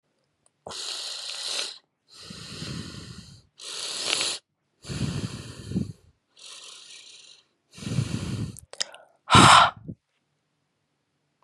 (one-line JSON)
{"exhalation_length": "11.4 s", "exhalation_amplitude": 30564, "exhalation_signal_mean_std_ratio": 0.33, "survey_phase": "alpha (2021-03-01 to 2021-08-12)", "age": "18-44", "gender": "Female", "wearing_mask": "No", "symptom_cough_any": true, "symptom_fatigue": true, "symptom_fever_high_temperature": true, "smoker_status": "Never smoked", "respiratory_condition_asthma": false, "respiratory_condition_other": false, "recruitment_source": "Test and Trace", "submission_delay": "0 days", "covid_test_result": "Positive", "covid_test_method": "LFT"}